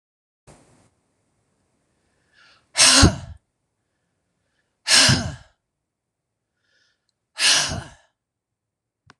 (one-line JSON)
{"exhalation_length": "9.2 s", "exhalation_amplitude": 26028, "exhalation_signal_mean_std_ratio": 0.27, "survey_phase": "beta (2021-08-13 to 2022-03-07)", "age": "65+", "gender": "Female", "wearing_mask": "No", "symptom_none": true, "smoker_status": "Never smoked", "respiratory_condition_asthma": false, "respiratory_condition_other": false, "recruitment_source": "REACT", "submission_delay": "1 day", "covid_test_result": "Negative", "covid_test_method": "RT-qPCR"}